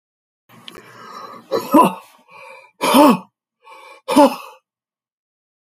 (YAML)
exhalation_length: 5.7 s
exhalation_amplitude: 31072
exhalation_signal_mean_std_ratio: 0.33
survey_phase: beta (2021-08-13 to 2022-03-07)
age: 45-64
gender: Male
wearing_mask: 'No'
symptom_cough_any: true
symptom_runny_or_blocked_nose: true
symptom_headache: true
symptom_onset: 4 days
smoker_status: Ex-smoker
respiratory_condition_asthma: false
respiratory_condition_other: false
recruitment_source: Test and Trace
submission_delay: 1 day
covid_test_result: Positive
covid_test_method: RT-qPCR
covid_ct_value: 31.3
covid_ct_gene: N gene